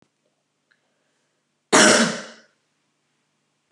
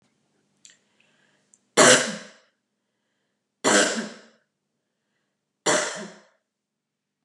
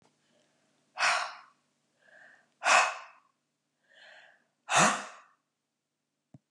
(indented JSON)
{
  "cough_length": "3.7 s",
  "cough_amplitude": 30468,
  "cough_signal_mean_std_ratio": 0.27,
  "three_cough_length": "7.2 s",
  "three_cough_amplitude": 30773,
  "three_cough_signal_mean_std_ratio": 0.28,
  "exhalation_length": "6.5 s",
  "exhalation_amplitude": 11216,
  "exhalation_signal_mean_std_ratio": 0.3,
  "survey_phase": "beta (2021-08-13 to 2022-03-07)",
  "age": "65+",
  "gender": "Female",
  "wearing_mask": "No",
  "symptom_none": true,
  "smoker_status": "Ex-smoker",
  "respiratory_condition_asthma": false,
  "respiratory_condition_other": false,
  "recruitment_source": "REACT",
  "submission_delay": "1 day",
  "covid_test_result": "Negative",
  "covid_test_method": "RT-qPCR",
  "influenza_a_test_result": "Negative",
  "influenza_b_test_result": "Negative"
}